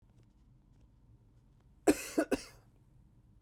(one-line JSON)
{"cough_length": "3.4 s", "cough_amplitude": 6660, "cough_signal_mean_std_ratio": 0.25, "survey_phase": "beta (2021-08-13 to 2022-03-07)", "age": "18-44", "gender": "Male", "wearing_mask": "Yes", "symptom_cough_any": true, "symptom_shortness_of_breath": true, "symptom_fatigue": true, "symptom_headache": true, "symptom_change_to_sense_of_smell_or_taste": true, "symptom_onset": "6 days", "smoker_status": "Never smoked", "respiratory_condition_asthma": false, "respiratory_condition_other": false, "recruitment_source": "Test and Trace", "submission_delay": "2 days", "covid_test_result": "Positive", "covid_test_method": "RT-qPCR", "covid_ct_value": 14.5, "covid_ct_gene": "N gene", "covid_ct_mean": 15.1, "covid_viral_load": "11000000 copies/ml", "covid_viral_load_category": "High viral load (>1M copies/ml)"}